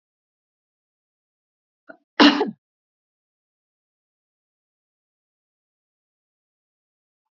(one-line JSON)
{"cough_length": "7.3 s", "cough_amplitude": 28023, "cough_signal_mean_std_ratio": 0.14, "survey_phase": "beta (2021-08-13 to 2022-03-07)", "age": "65+", "gender": "Female", "wearing_mask": "No", "symptom_none": true, "smoker_status": "Ex-smoker", "respiratory_condition_asthma": false, "respiratory_condition_other": false, "recruitment_source": "REACT", "submission_delay": "2 days", "covid_test_result": "Negative", "covid_test_method": "RT-qPCR", "influenza_a_test_result": "Negative", "influenza_b_test_result": "Negative"}